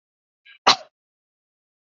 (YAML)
cough_length: 1.9 s
cough_amplitude: 26964
cough_signal_mean_std_ratio: 0.16
survey_phase: alpha (2021-03-01 to 2021-08-12)
age: 45-64
gender: Female
wearing_mask: 'No'
symptom_none: true
symptom_onset: 3 days
smoker_status: Never smoked
respiratory_condition_asthma: false
respiratory_condition_other: false
recruitment_source: REACT
submission_delay: 3 days
covid_test_result: Negative
covid_test_method: RT-qPCR